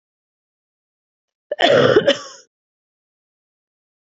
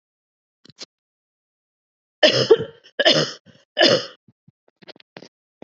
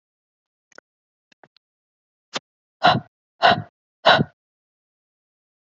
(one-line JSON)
{"cough_length": "4.2 s", "cough_amplitude": 27821, "cough_signal_mean_std_ratio": 0.29, "three_cough_length": "5.6 s", "three_cough_amplitude": 30744, "three_cough_signal_mean_std_ratio": 0.3, "exhalation_length": "5.6 s", "exhalation_amplitude": 26716, "exhalation_signal_mean_std_ratio": 0.23, "survey_phase": "beta (2021-08-13 to 2022-03-07)", "age": "18-44", "gender": "Female", "wearing_mask": "No", "symptom_cough_any": true, "symptom_runny_or_blocked_nose": true, "symptom_onset": "4 days", "smoker_status": "Never smoked", "respiratory_condition_asthma": false, "respiratory_condition_other": false, "recruitment_source": "Test and Trace", "submission_delay": "3 days", "covid_test_result": "Positive", "covid_test_method": "RT-qPCR", "covid_ct_value": 24.4, "covid_ct_gene": "N gene"}